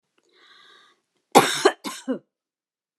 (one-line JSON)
{"cough_length": "3.0 s", "cough_amplitude": 29200, "cough_signal_mean_std_ratio": 0.26, "survey_phase": "beta (2021-08-13 to 2022-03-07)", "age": "45-64", "gender": "Female", "wearing_mask": "No", "symptom_sore_throat": true, "symptom_headache": true, "smoker_status": "Never smoked", "respiratory_condition_asthma": false, "respiratory_condition_other": false, "recruitment_source": "REACT", "submission_delay": "3 days", "covid_test_result": "Negative", "covid_test_method": "RT-qPCR"}